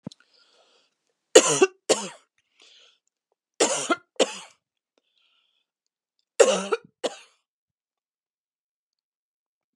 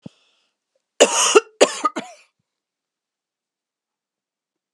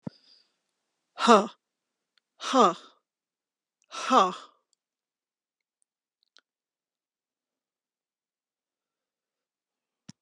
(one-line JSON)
{"three_cough_length": "9.8 s", "three_cough_amplitude": 32767, "three_cough_signal_mean_std_ratio": 0.23, "cough_length": "4.7 s", "cough_amplitude": 32768, "cough_signal_mean_std_ratio": 0.25, "exhalation_length": "10.2 s", "exhalation_amplitude": 21777, "exhalation_signal_mean_std_ratio": 0.2, "survey_phase": "beta (2021-08-13 to 2022-03-07)", "age": "65+", "gender": "Female", "wearing_mask": "No", "symptom_none": true, "smoker_status": "Never smoked", "respiratory_condition_asthma": false, "respiratory_condition_other": false, "recruitment_source": "Test and Trace", "submission_delay": "2 days", "covid_test_result": "Negative", "covid_test_method": "RT-qPCR"}